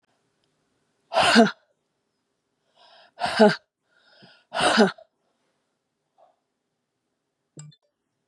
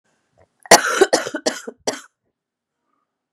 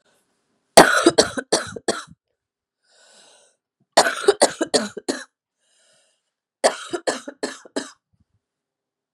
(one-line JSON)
{"exhalation_length": "8.3 s", "exhalation_amplitude": 23648, "exhalation_signal_mean_std_ratio": 0.27, "cough_length": "3.3 s", "cough_amplitude": 32768, "cough_signal_mean_std_ratio": 0.29, "three_cough_length": "9.1 s", "three_cough_amplitude": 32768, "three_cough_signal_mean_std_ratio": 0.28, "survey_phase": "beta (2021-08-13 to 2022-03-07)", "age": "45-64", "gender": "Female", "wearing_mask": "No", "symptom_cough_any": true, "symptom_runny_or_blocked_nose": true, "symptom_onset": "5 days", "smoker_status": "Ex-smoker", "respiratory_condition_asthma": false, "respiratory_condition_other": false, "recruitment_source": "REACT", "submission_delay": "3 days", "covid_test_result": "Negative", "covid_test_method": "RT-qPCR", "influenza_a_test_result": "Negative", "influenza_b_test_result": "Negative"}